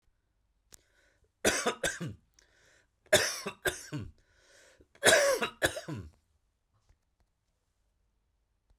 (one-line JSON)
{"three_cough_length": "8.8 s", "three_cough_amplitude": 13844, "three_cough_signal_mean_std_ratio": 0.32, "survey_phase": "beta (2021-08-13 to 2022-03-07)", "age": "45-64", "gender": "Male", "wearing_mask": "No", "symptom_none": true, "smoker_status": "Never smoked", "respiratory_condition_asthma": false, "respiratory_condition_other": false, "recruitment_source": "REACT", "submission_delay": "1 day", "covid_test_result": "Negative", "covid_test_method": "RT-qPCR"}